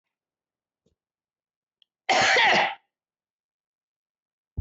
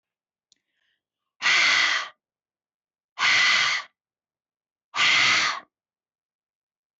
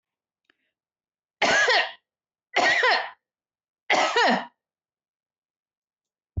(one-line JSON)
{"cough_length": "4.6 s", "cough_amplitude": 13218, "cough_signal_mean_std_ratio": 0.31, "exhalation_length": "7.0 s", "exhalation_amplitude": 14207, "exhalation_signal_mean_std_ratio": 0.44, "three_cough_length": "6.4 s", "three_cough_amplitude": 15012, "three_cough_signal_mean_std_ratio": 0.41, "survey_phase": "beta (2021-08-13 to 2022-03-07)", "age": "45-64", "gender": "Female", "wearing_mask": "No", "symptom_fatigue": true, "symptom_onset": "5 days", "smoker_status": "Never smoked", "respiratory_condition_asthma": false, "respiratory_condition_other": false, "recruitment_source": "REACT", "submission_delay": "5 days", "covid_test_result": "Negative", "covid_test_method": "RT-qPCR"}